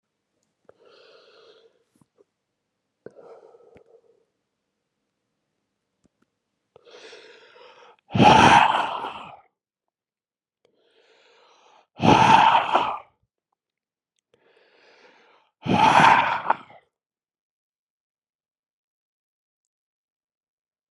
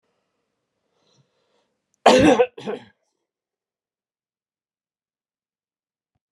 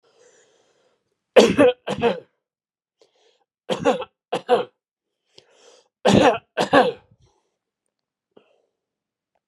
{"exhalation_length": "20.9 s", "exhalation_amplitude": 32075, "exhalation_signal_mean_std_ratio": 0.27, "cough_length": "6.3 s", "cough_amplitude": 32070, "cough_signal_mean_std_ratio": 0.21, "three_cough_length": "9.5 s", "three_cough_amplitude": 32768, "three_cough_signal_mean_std_ratio": 0.31, "survey_phase": "beta (2021-08-13 to 2022-03-07)", "age": "65+", "gender": "Male", "wearing_mask": "No", "symptom_none": true, "smoker_status": "Never smoked", "respiratory_condition_asthma": false, "respiratory_condition_other": true, "recruitment_source": "REACT", "submission_delay": "1 day", "covid_test_result": "Negative", "covid_test_method": "RT-qPCR"}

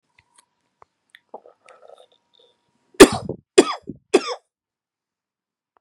{"three_cough_length": "5.8 s", "three_cough_amplitude": 32768, "three_cough_signal_mean_std_ratio": 0.17, "survey_phase": "beta (2021-08-13 to 2022-03-07)", "age": "18-44", "gender": "Male", "wearing_mask": "No", "symptom_cough_any": true, "symptom_runny_or_blocked_nose": true, "symptom_sore_throat": true, "smoker_status": "Current smoker (e-cigarettes or vapes only)", "respiratory_condition_asthma": false, "respiratory_condition_other": false, "recruitment_source": "Test and Trace", "submission_delay": "0 days", "covid_test_result": "Positive", "covid_test_method": "LFT"}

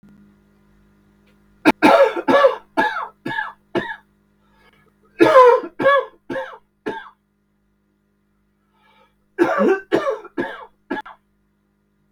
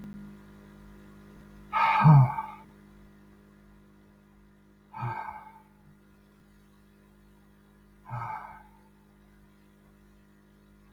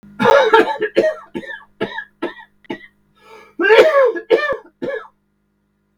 {"three_cough_length": "12.1 s", "three_cough_amplitude": 32768, "three_cough_signal_mean_std_ratio": 0.37, "exhalation_length": "10.9 s", "exhalation_amplitude": 13679, "exhalation_signal_mean_std_ratio": 0.26, "cough_length": "6.0 s", "cough_amplitude": 32768, "cough_signal_mean_std_ratio": 0.48, "survey_phase": "beta (2021-08-13 to 2022-03-07)", "age": "45-64", "gender": "Male", "wearing_mask": "No", "symptom_none": true, "smoker_status": "Ex-smoker", "respiratory_condition_asthma": true, "respiratory_condition_other": false, "recruitment_source": "REACT", "submission_delay": "0 days", "covid_test_result": "Negative", "covid_test_method": "RT-qPCR", "influenza_a_test_result": "Negative", "influenza_b_test_result": "Negative"}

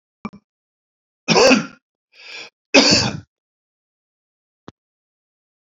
{"three_cough_length": "5.6 s", "three_cough_amplitude": 32717, "three_cough_signal_mean_std_ratio": 0.29, "survey_phase": "alpha (2021-03-01 to 2021-08-12)", "age": "65+", "gender": "Male", "wearing_mask": "No", "symptom_cough_any": true, "smoker_status": "Ex-smoker", "respiratory_condition_asthma": false, "respiratory_condition_other": false, "recruitment_source": "REACT", "submission_delay": "1 day", "covid_test_result": "Negative", "covid_test_method": "RT-qPCR"}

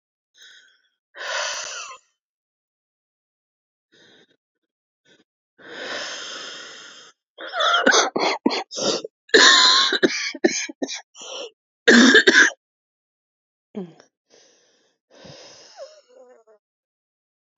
{"exhalation_length": "17.6 s", "exhalation_amplitude": 30824, "exhalation_signal_mean_std_ratio": 0.34, "survey_phase": "beta (2021-08-13 to 2022-03-07)", "age": "18-44", "gender": "Female", "wearing_mask": "No", "symptom_cough_any": true, "symptom_new_continuous_cough": true, "symptom_runny_or_blocked_nose": true, "symptom_shortness_of_breath": true, "symptom_sore_throat": true, "symptom_fatigue": true, "symptom_headache": true, "symptom_onset": "7 days", "smoker_status": "Never smoked", "respiratory_condition_asthma": true, "respiratory_condition_other": false, "recruitment_source": "Test and Trace", "submission_delay": "1 day", "covid_test_result": "Positive", "covid_test_method": "ePCR"}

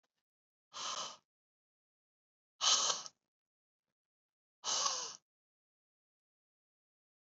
{"exhalation_length": "7.3 s", "exhalation_amplitude": 4663, "exhalation_signal_mean_std_ratio": 0.29, "survey_phase": "beta (2021-08-13 to 2022-03-07)", "age": "18-44", "gender": "Male", "wearing_mask": "No", "symptom_cough_any": true, "symptom_runny_or_blocked_nose": true, "symptom_sore_throat": true, "symptom_fatigue": true, "symptom_fever_high_temperature": true, "symptom_change_to_sense_of_smell_or_taste": true, "symptom_onset": "3 days", "smoker_status": "Ex-smoker", "respiratory_condition_asthma": false, "respiratory_condition_other": false, "recruitment_source": "Test and Trace", "submission_delay": "1 day", "covid_test_result": "Positive", "covid_test_method": "ePCR"}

